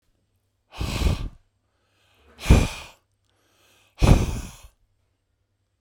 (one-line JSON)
{"exhalation_length": "5.8 s", "exhalation_amplitude": 26714, "exhalation_signal_mean_std_ratio": 0.3, "survey_phase": "beta (2021-08-13 to 2022-03-07)", "age": "45-64", "gender": "Male", "wearing_mask": "No", "symptom_none": true, "smoker_status": "Ex-smoker", "respiratory_condition_asthma": false, "respiratory_condition_other": false, "recruitment_source": "REACT", "submission_delay": "2 days", "covid_test_result": "Negative", "covid_test_method": "RT-qPCR"}